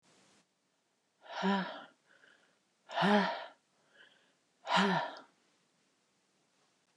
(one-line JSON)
{"exhalation_length": "7.0 s", "exhalation_amplitude": 5608, "exhalation_signal_mean_std_ratio": 0.35, "survey_phase": "beta (2021-08-13 to 2022-03-07)", "age": "65+", "gender": "Female", "wearing_mask": "No", "symptom_none": true, "smoker_status": "Never smoked", "respiratory_condition_asthma": false, "respiratory_condition_other": false, "recruitment_source": "REACT", "submission_delay": "1 day", "covid_test_result": "Negative", "covid_test_method": "RT-qPCR", "influenza_a_test_result": "Negative", "influenza_b_test_result": "Negative"}